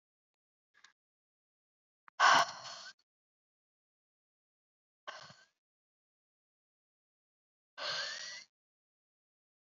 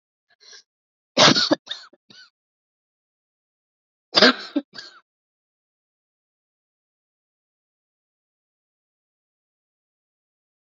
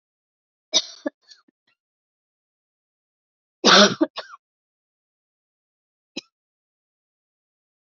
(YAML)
exhalation_length: 9.7 s
exhalation_amplitude: 7504
exhalation_signal_mean_std_ratio: 0.19
cough_length: 10.7 s
cough_amplitude: 31647
cough_signal_mean_std_ratio: 0.18
three_cough_length: 7.9 s
three_cough_amplitude: 30789
three_cough_signal_mean_std_ratio: 0.18
survey_phase: beta (2021-08-13 to 2022-03-07)
age: 18-44
gender: Female
wearing_mask: 'No'
symptom_none: true
smoker_status: Never smoked
respiratory_condition_asthma: false
respiratory_condition_other: false
recruitment_source: REACT
submission_delay: 0 days
covid_test_result: Negative
covid_test_method: RT-qPCR
influenza_a_test_result: Negative
influenza_b_test_result: Negative